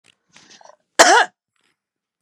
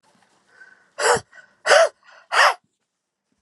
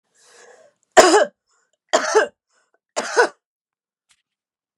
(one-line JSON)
{"cough_length": "2.2 s", "cough_amplitude": 32768, "cough_signal_mean_std_ratio": 0.27, "exhalation_length": "3.4 s", "exhalation_amplitude": 29573, "exhalation_signal_mean_std_ratio": 0.35, "three_cough_length": "4.8 s", "three_cough_amplitude": 32768, "three_cough_signal_mean_std_ratio": 0.3, "survey_phase": "beta (2021-08-13 to 2022-03-07)", "age": "45-64", "gender": "Female", "wearing_mask": "No", "symptom_none": true, "symptom_onset": "12 days", "smoker_status": "Never smoked", "respiratory_condition_asthma": true, "respiratory_condition_other": false, "recruitment_source": "REACT", "submission_delay": "2 days", "covid_test_result": "Negative", "covid_test_method": "RT-qPCR"}